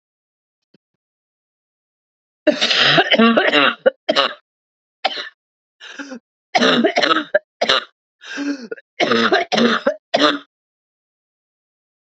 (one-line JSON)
{"three_cough_length": "12.1 s", "three_cough_amplitude": 30409, "three_cough_signal_mean_std_ratio": 0.45, "survey_phase": "beta (2021-08-13 to 2022-03-07)", "age": "45-64", "gender": "Female", "wearing_mask": "No", "symptom_cough_any": true, "symptom_runny_or_blocked_nose": true, "symptom_sore_throat": true, "symptom_headache": true, "symptom_other": true, "smoker_status": "Never smoked", "respiratory_condition_asthma": false, "respiratory_condition_other": false, "recruitment_source": "Test and Trace", "submission_delay": "2 days", "covid_test_result": "Positive", "covid_test_method": "RT-qPCR", "covid_ct_value": 30.6, "covid_ct_gene": "ORF1ab gene"}